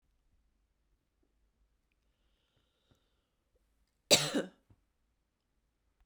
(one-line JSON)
{"cough_length": "6.1 s", "cough_amplitude": 13297, "cough_signal_mean_std_ratio": 0.16, "survey_phase": "beta (2021-08-13 to 2022-03-07)", "age": "18-44", "gender": "Female", "wearing_mask": "No", "symptom_runny_or_blocked_nose": true, "symptom_fatigue": true, "symptom_headache": true, "symptom_other": true, "symptom_onset": "2 days", "smoker_status": "Never smoked", "respiratory_condition_asthma": false, "respiratory_condition_other": false, "recruitment_source": "Test and Trace", "submission_delay": "2 days", "covid_test_result": "Positive", "covid_test_method": "RT-qPCR", "covid_ct_value": 31.5, "covid_ct_gene": "N gene"}